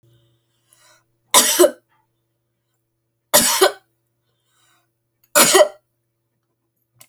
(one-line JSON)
{"three_cough_length": "7.1 s", "three_cough_amplitude": 32768, "three_cough_signal_mean_std_ratio": 0.29, "survey_phase": "beta (2021-08-13 to 2022-03-07)", "age": "65+", "gender": "Female", "wearing_mask": "No", "symptom_none": true, "smoker_status": "Ex-smoker", "respiratory_condition_asthma": false, "respiratory_condition_other": false, "recruitment_source": "REACT", "submission_delay": "4 days", "covid_test_result": "Negative", "covid_test_method": "RT-qPCR"}